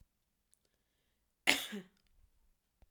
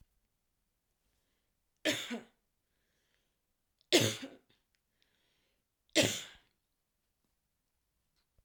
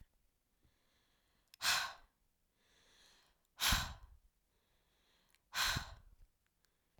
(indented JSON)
{
  "cough_length": "2.9 s",
  "cough_amplitude": 16287,
  "cough_signal_mean_std_ratio": 0.2,
  "three_cough_length": "8.4 s",
  "three_cough_amplitude": 8036,
  "three_cough_signal_mean_std_ratio": 0.22,
  "exhalation_length": "7.0 s",
  "exhalation_amplitude": 3028,
  "exhalation_signal_mean_std_ratio": 0.3,
  "survey_phase": "beta (2021-08-13 to 2022-03-07)",
  "age": "18-44",
  "gender": "Female",
  "wearing_mask": "No",
  "symptom_cough_any": true,
  "symptom_runny_or_blocked_nose": true,
  "symptom_shortness_of_breath": true,
  "symptom_sore_throat": true,
  "symptom_fatigue": true,
  "symptom_change_to_sense_of_smell_or_taste": true,
  "symptom_onset": "2 days",
  "smoker_status": "Never smoked",
  "respiratory_condition_asthma": false,
  "respiratory_condition_other": false,
  "recruitment_source": "Test and Trace",
  "submission_delay": "2 days",
  "covid_test_result": "Positive",
  "covid_test_method": "RT-qPCR",
  "covid_ct_value": 16.7,
  "covid_ct_gene": "N gene"
}